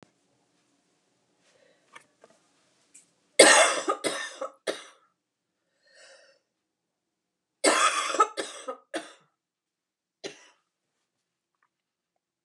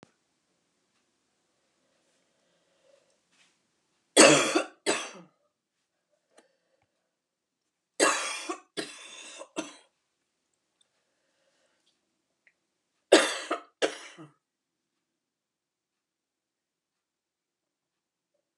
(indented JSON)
{
  "cough_length": "12.4 s",
  "cough_amplitude": 30823,
  "cough_signal_mean_std_ratio": 0.25,
  "three_cough_length": "18.6 s",
  "three_cough_amplitude": 22223,
  "three_cough_signal_mean_std_ratio": 0.2,
  "survey_phase": "beta (2021-08-13 to 2022-03-07)",
  "age": "45-64",
  "gender": "Female",
  "wearing_mask": "No",
  "symptom_none": true,
  "smoker_status": "Ex-smoker",
  "respiratory_condition_asthma": false,
  "respiratory_condition_other": true,
  "recruitment_source": "REACT",
  "submission_delay": "3 days",
  "covid_test_result": "Negative",
  "covid_test_method": "RT-qPCR"
}